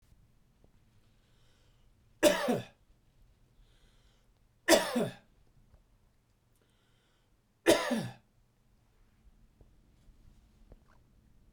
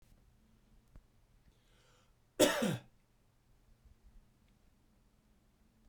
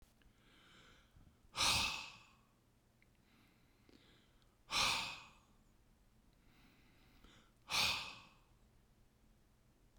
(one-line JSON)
{"three_cough_length": "11.5 s", "three_cough_amplitude": 14223, "three_cough_signal_mean_std_ratio": 0.25, "cough_length": "5.9 s", "cough_amplitude": 7219, "cough_signal_mean_std_ratio": 0.22, "exhalation_length": "10.0 s", "exhalation_amplitude": 2547, "exhalation_signal_mean_std_ratio": 0.33, "survey_phase": "beta (2021-08-13 to 2022-03-07)", "age": "45-64", "gender": "Male", "wearing_mask": "No", "symptom_none": true, "symptom_onset": "6 days", "smoker_status": "Never smoked", "respiratory_condition_asthma": false, "respiratory_condition_other": false, "recruitment_source": "REACT", "submission_delay": "1 day", "covid_test_result": "Negative", "covid_test_method": "RT-qPCR", "influenza_a_test_result": "Negative", "influenza_b_test_result": "Negative"}